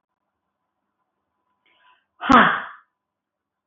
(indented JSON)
{
  "exhalation_length": "3.7 s",
  "exhalation_amplitude": 25197,
  "exhalation_signal_mean_std_ratio": 0.23,
  "survey_phase": "beta (2021-08-13 to 2022-03-07)",
  "age": "65+",
  "gender": "Female",
  "wearing_mask": "No",
  "symptom_none": true,
  "smoker_status": "Ex-smoker",
  "respiratory_condition_asthma": false,
  "respiratory_condition_other": false,
  "recruitment_source": "REACT",
  "submission_delay": "1 day",
  "covid_test_result": "Negative",
  "covid_test_method": "RT-qPCR",
  "influenza_a_test_result": "Negative",
  "influenza_b_test_result": "Negative"
}